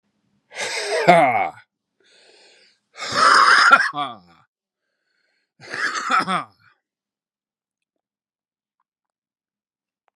exhalation_length: 10.2 s
exhalation_amplitude: 32635
exhalation_signal_mean_std_ratio: 0.36
survey_phase: beta (2021-08-13 to 2022-03-07)
age: 45-64
gender: Male
wearing_mask: 'No'
symptom_cough_any: true
symptom_runny_or_blocked_nose: true
symptom_change_to_sense_of_smell_or_taste: true
symptom_onset: 6 days
smoker_status: Ex-smoker
respiratory_condition_asthma: false
respiratory_condition_other: false
recruitment_source: Test and Trace
submission_delay: 1 day
covid_test_result: Positive
covid_test_method: RT-qPCR
covid_ct_value: 21.1
covid_ct_gene: ORF1ab gene
covid_ct_mean: 22.0
covid_viral_load: 59000 copies/ml
covid_viral_load_category: Low viral load (10K-1M copies/ml)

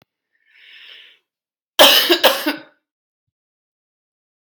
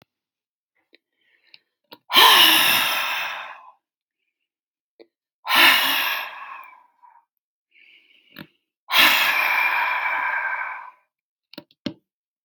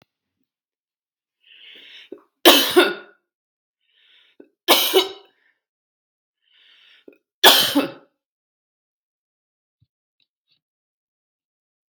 cough_length: 4.5 s
cough_amplitude: 32768
cough_signal_mean_std_ratio: 0.29
exhalation_length: 12.4 s
exhalation_amplitude: 31737
exhalation_signal_mean_std_ratio: 0.43
three_cough_length: 11.9 s
three_cough_amplitude: 32768
three_cough_signal_mean_std_ratio: 0.24
survey_phase: beta (2021-08-13 to 2022-03-07)
age: 65+
gender: Female
wearing_mask: 'No'
symptom_cough_any: true
symptom_runny_or_blocked_nose: true
symptom_sore_throat: true
symptom_headache: true
symptom_onset: 2 days
smoker_status: Ex-smoker
respiratory_condition_asthma: false
respiratory_condition_other: false
recruitment_source: Test and Trace
submission_delay: 1 day
covid_test_result: Negative
covid_test_method: RT-qPCR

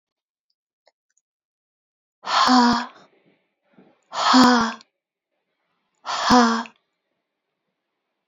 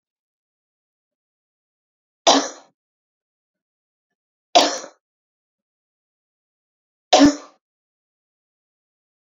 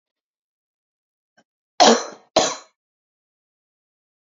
exhalation_length: 8.3 s
exhalation_amplitude: 26726
exhalation_signal_mean_std_ratio: 0.35
three_cough_length: 9.2 s
three_cough_amplitude: 30153
three_cough_signal_mean_std_ratio: 0.2
cough_length: 4.4 s
cough_amplitude: 31220
cough_signal_mean_std_ratio: 0.22
survey_phase: beta (2021-08-13 to 2022-03-07)
age: 45-64
gender: Female
wearing_mask: 'No'
symptom_cough_any: true
symptom_change_to_sense_of_smell_or_taste: true
symptom_onset: 2 days
smoker_status: Never smoked
respiratory_condition_asthma: false
respiratory_condition_other: false
recruitment_source: Test and Trace
submission_delay: 2 days
covid_test_result: Positive
covid_test_method: RT-qPCR
covid_ct_value: 23.7
covid_ct_gene: ORF1ab gene
covid_ct_mean: 23.9
covid_viral_load: 14000 copies/ml
covid_viral_load_category: Low viral load (10K-1M copies/ml)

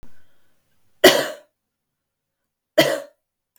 cough_length: 3.6 s
cough_amplitude: 32768
cough_signal_mean_std_ratio: 0.27
survey_phase: beta (2021-08-13 to 2022-03-07)
age: 45-64
gender: Female
wearing_mask: 'No'
symptom_cough_any: true
symptom_fatigue: true
symptom_onset: 12 days
smoker_status: Current smoker (e-cigarettes or vapes only)
respiratory_condition_asthma: false
respiratory_condition_other: false
recruitment_source: REACT
submission_delay: 3 days
covid_test_result: Negative
covid_test_method: RT-qPCR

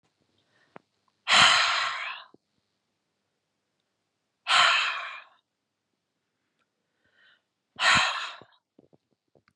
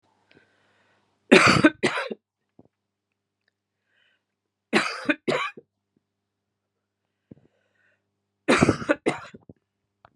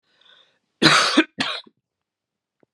exhalation_length: 9.6 s
exhalation_amplitude: 23954
exhalation_signal_mean_std_ratio: 0.33
three_cough_length: 10.2 s
three_cough_amplitude: 32767
three_cough_signal_mean_std_ratio: 0.27
cough_length: 2.7 s
cough_amplitude: 32767
cough_signal_mean_std_ratio: 0.34
survey_phase: beta (2021-08-13 to 2022-03-07)
age: 45-64
gender: Female
wearing_mask: 'No'
symptom_none: true
smoker_status: Ex-smoker
respiratory_condition_asthma: false
respiratory_condition_other: false
recruitment_source: REACT
submission_delay: 2 days
covid_test_result: Negative
covid_test_method: RT-qPCR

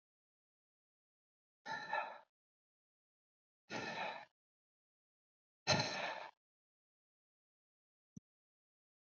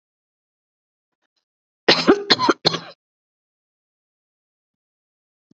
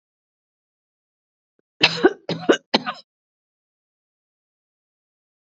exhalation_length: 9.1 s
exhalation_amplitude: 4035
exhalation_signal_mean_std_ratio: 0.28
cough_length: 5.5 s
cough_amplitude: 30636
cough_signal_mean_std_ratio: 0.23
three_cough_length: 5.5 s
three_cough_amplitude: 32633
three_cough_signal_mean_std_ratio: 0.21
survey_phase: alpha (2021-03-01 to 2021-08-12)
age: 45-64
gender: Female
wearing_mask: 'No'
symptom_none: true
symptom_cough_any: true
symptom_shortness_of_breath: true
symptom_abdominal_pain: true
symptom_fatigue: true
symptom_fever_high_temperature: true
symptom_headache: true
symptom_change_to_sense_of_smell_or_taste: true
symptom_loss_of_taste: true
symptom_onset: 3 days
smoker_status: Current smoker (1 to 10 cigarettes per day)
respiratory_condition_asthma: false
respiratory_condition_other: true
recruitment_source: Test and Trace
submission_delay: 2 days
covid_test_result: Positive
covid_test_method: RT-qPCR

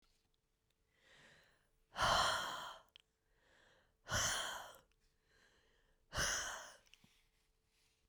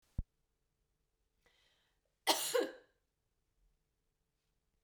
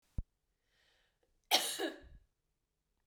exhalation_length: 8.1 s
exhalation_amplitude: 2713
exhalation_signal_mean_std_ratio: 0.38
three_cough_length: 4.8 s
three_cough_amplitude: 5595
three_cough_signal_mean_std_ratio: 0.23
cough_length: 3.1 s
cough_amplitude: 6904
cough_signal_mean_std_ratio: 0.28
survey_phase: beta (2021-08-13 to 2022-03-07)
age: 18-44
gender: Female
wearing_mask: 'No'
symptom_cough_any: true
symptom_shortness_of_breath: true
symptom_fatigue: true
symptom_headache: true
symptom_other: true
symptom_onset: 6 days
smoker_status: Never smoked
respiratory_condition_asthma: false
respiratory_condition_other: false
recruitment_source: Test and Trace
submission_delay: 2 days
covid_test_result: Positive
covid_test_method: RT-qPCR
covid_ct_value: 17.6
covid_ct_gene: ORF1ab gene
covid_ct_mean: 17.9
covid_viral_load: 1300000 copies/ml
covid_viral_load_category: High viral load (>1M copies/ml)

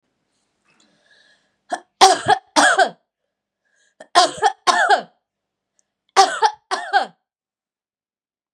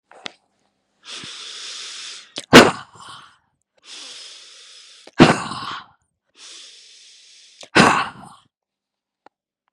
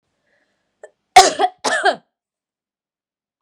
three_cough_length: 8.5 s
three_cough_amplitude: 32768
three_cough_signal_mean_std_ratio: 0.34
exhalation_length: 9.7 s
exhalation_amplitude: 32768
exhalation_signal_mean_std_ratio: 0.25
cough_length: 3.4 s
cough_amplitude: 32768
cough_signal_mean_std_ratio: 0.27
survey_phase: beta (2021-08-13 to 2022-03-07)
age: 45-64
gender: Female
wearing_mask: 'No'
symptom_none: true
smoker_status: Never smoked
respiratory_condition_asthma: false
respiratory_condition_other: false
recruitment_source: REACT
submission_delay: 1 day
covid_test_result: Negative
covid_test_method: RT-qPCR
influenza_a_test_result: Negative
influenza_b_test_result: Negative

